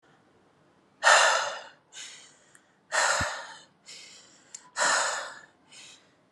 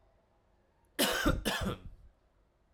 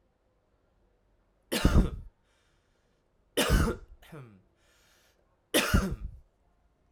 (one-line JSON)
{"exhalation_length": "6.3 s", "exhalation_amplitude": 20026, "exhalation_signal_mean_std_ratio": 0.4, "cough_length": "2.7 s", "cough_amplitude": 5375, "cough_signal_mean_std_ratio": 0.44, "three_cough_length": "6.9 s", "three_cough_amplitude": 12943, "three_cough_signal_mean_std_ratio": 0.33, "survey_phase": "alpha (2021-03-01 to 2021-08-12)", "age": "18-44", "gender": "Male", "wearing_mask": "No", "symptom_cough_any": true, "smoker_status": "Never smoked", "respiratory_condition_asthma": false, "respiratory_condition_other": false, "recruitment_source": "Test and Trace", "submission_delay": "2 days", "covid_test_result": "Positive", "covid_test_method": "RT-qPCR", "covid_ct_value": 16.5, "covid_ct_gene": "ORF1ab gene", "covid_ct_mean": 17.6, "covid_viral_load": "1700000 copies/ml", "covid_viral_load_category": "High viral load (>1M copies/ml)"}